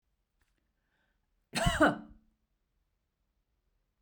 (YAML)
cough_length: 4.0 s
cough_amplitude: 7330
cough_signal_mean_std_ratio: 0.24
survey_phase: beta (2021-08-13 to 2022-03-07)
age: 45-64
gender: Female
wearing_mask: 'No'
symptom_none: true
smoker_status: Never smoked
respiratory_condition_asthma: false
respiratory_condition_other: false
recruitment_source: REACT
submission_delay: 1 day
covid_test_result: Negative
covid_test_method: RT-qPCR
influenza_a_test_result: Negative
influenza_b_test_result: Negative